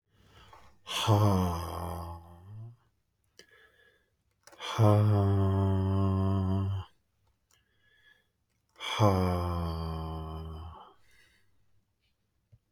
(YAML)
exhalation_length: 12.7 s
exhalation_amplitude: 10118
exhalation_signal_mean_std_ratio: 0.53
survey_phase: beta (2021-08-13 to 2022-03-07)
age: 45-64
gender: Male
wearing_mask: 'No'
symptom_none: true
smoker_status: Never smoked
respiratory_condition_asthma: false
respiratory_condition_other: false
recruitment_source: REACT
submission_delay: 2 days
covid_test_result: Negative
covid_test_method: RT-qPCR